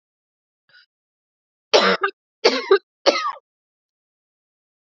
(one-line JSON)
{"cough_length": "4.9 s", "cough_amplitude": 29734, "cough_signal_mean_std_ratio": 0.29, "survey_phase": "alpha (2021-03-01 to 2021-08-12)", "age": "18-44", "gender": "Female", "wearing_mask": "No", "symptom_cough_any": true, "symptom_new_continuous_cough": true, "symptom_diarrhoea": true, "symptom_fatigue": true, "symptom_fever_high_temperature": true, "symptom_headache": true, "symptom_change_to_sense_of_smell_or_taste": true, "symptom_loss_of_taste": true, "symptom_onset": "4 days", "smoker_status": "Never smoked", "respiratory_condition_asthma": false, "respiratory_condition_other": false, "recruitment_source": "Test and Trace", "submission_delay": "2 days", "covid_test_result": "Positive", "covid_test_method": "RT-qPCR", "covid_ct_value": 21.4, "covid_ct_gene": "N gene", "covid_ct_mean": 21.5, "covid_viral_load": "91000 copies/ml", "covid_viral_load_category": "Low viral load (10K-1M copies/ml)"}